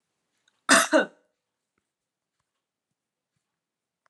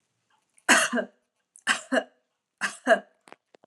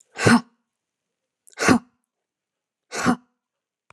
{
  "cough_length": "4.1 s",
  "cough_amplitude": 21768,
  "cough_signal_mean_std_ratio": 0.21,
  "three_cough_length": "3.7 s",
  "three_cough_amplitude": 18945,
  "three_cough_signal_mean_std_ratio": 0.34,
  "exhalation_length": "3.9 s",
  "exhalation_amplitude": 28493,
  "exhalation_signal_mean_std_ratio": 0.28,
  "survey_phase": "beta (2021-08-13 to 2022-03-07)",
  "age": "18-44",
  "gender": "Female",
  "wearing_mask": "No",
  "symptom_none": true,
  "smoker_status": "Never smoked",
  "respiratory_condition_asthma": false,
  "respiratory_condition_other": false,
  "recruitment_source": "REACT",
  "submission_delay": "1 day",
  "covid_test_result": "Negative",
  "covid_test_method": "RT-qPCR"
}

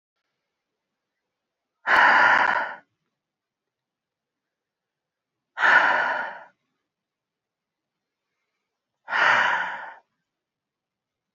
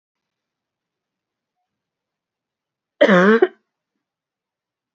{
  "exhalation_length": "11.3 s",
  "exhalation_amplitude": 23690,
  "exhalation_signal_mean_std_ratio": 0.34,
  "cough_length": "4.9 s",
  "cough_amplitude": 27419,
  "cough_signal_mean_std_ratio": 0.24,
  "survey_phase": "beta (2021-08-13 to 2022-03-07)",
  "age": "45-64",
  "gender": "Female",
  "wearing_mask": "Yes",
  "symptom_cough_any": true,
  "symptom_runny_or_blocked_nose": true,
  "symptom_onset": "3 days",
  "smoker_status": "Current smoker (e-cigarettes or vapes only)",
  "respiratory_condition_asthma": false,
  "respiratory_condition_other": false,
  "recruitment_source": "Test and Trace",
  "submission_delay": "1 day",
  "covid_test_result": "Positive",
  "covid_test_method": "RT-qPCR"
}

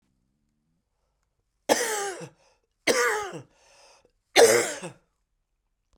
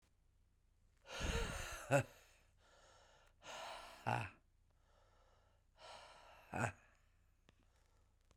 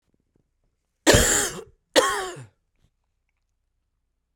{
  "three_cough_length": "6.0 s",
  "three_cough_amplitude": 24304,
  "three_cough_signal_mean_std_ratio": 0.33,
  "exhalation_length": "8.4 s",
  "exhalation_amplitude": 2663,
  "exhalation_signal_mean_std_ratio": 0.35,
  "cough_length": "4.4 s",
  "cough_amplitude": 32514,
  "cough_signal_mean_std_ratio": 0.32,
  "survey_phase": "beta (2021-08-13 to 2022-03-07)",
  "age": "45-64",
  "gender": "Male",
  "wearing_mask": "No",
  "symptom_cough_any": true,
  "symptom_runny_or_blocked_nose": true,
  "symptom_other": true,
  "smoker_status": "Never smoked",
  "respiratory_condition_asthma": false,
  "respiratory_condition_other": false,
  "recruitment_source": "Test and Trace",
  "submission_delay": "1 day",
  "covid_test_result": "Positive",
  "covid_test_method": "RT-qPCR"
}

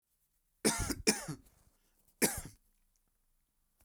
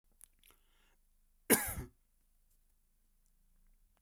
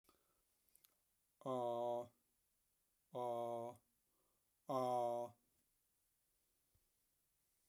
{
  "three_cough_length": "3.8 s",
  "three_cough_amplitude": 8312,
  "three_cough_signal_mean_std_ratio": 0.31,
  "cough_length": "4.0 s",
  "cough_amplitude": 8760,
  "cough_signal_mean_std_ratio": 0.2,
  "exhalation_length": "7.7 s",
  "exhalation_amplitude": 1185,
  "exhalation_signal_mean_std_ratio": 0.4,
  "survey_phase": "beta (2021-08-13 to 2022-03-07)",
  "age": "18-44",
  "gender": "Male",
  "wearing_mask": "No",
  "symptom_none": true,
  "smoker_status": "Never smoked",
  "respiratory_condition_asthma": false,
  "respiratory_condition_other": false,
  "recruitment_source": "Test and Trace",
  "submission_delay": "0 days",
  "covid_test_result": "Negative",
  "covid_test_method": "LFT"
}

